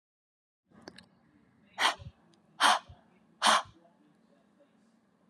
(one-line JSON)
{"exhalation_length": "5.3 s", "exhalation_amplitude": 10012, "exhalation_signal_mean_std_ratio": 0.27, "survey_phase": "alpha (2021-03-01 to 2021-08-12)", "age": "18-44", "gender": "Female", "wearing_mask": "No", "symptom_cough_any": true, "symptom_fatigue": true, "symptom_fever_high_temperature": true, "symptom_onset": "3 days", "smoker_status": "Current smoker (1 to 10 cigarettes per day)", "respiratory_condition_asthma": false, "respiratory_condition_other": false, "recruitment_source": "Test and Trace", "submission_delay": "2 days", "covid_test_result": "Positive", "covid_test_method": "RT-qPCR", "covid_ct_value": 17.4, "covid_ct_gene": "ORF1ab gene", "covid_ct_mean": 18.4, "covid_viral_load": "920000 copies/ml", "covid_viral_load_category": "Low viral load (10K-1M copies/ml)"}